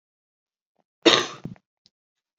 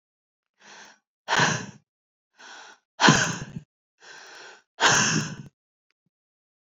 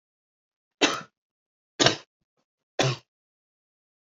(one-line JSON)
{"cough_length": "2.4 s", "cough_amplitude": 27896, "cough_signal_mean_std_ratio": 0.22, "exhalation_length": "6.7 s", "exhalation_amplitude": 25523, "exhalation_signal_mean_std_ratio": 0.34, "three_cough_length": "4.1 s", "three_cough_amplitude": 25455, "three_cough_signal_mean_std_ratio": 0.24, "survey_phase": "beta (2021-08-13 to 2022-03-07)", "age": "18-44", "gender": "Female", "wearing_mask": "No", "symptom_cough_any": true, "symptom_new_continuous_cough": true, "symptom_runny_or_blocked_nose": true, "symptom_sore_throat": true, "symptom_fatigue": true, "symptom_headache": true, "symptom_change_to_sense_of_smell_or_taste": true, "symptom_loss_of_taste": true, "symptom_onset": "3 days", "smoker_status": "Ex-smoker", "respiratory_condition_asthma": false, "respiratory_condition_other": false, "recruitment_source": "Test and Trace", "submission_delay": "1 day", "covid_test_result": "Positive", "covid_test_method": "RT-qPCR"}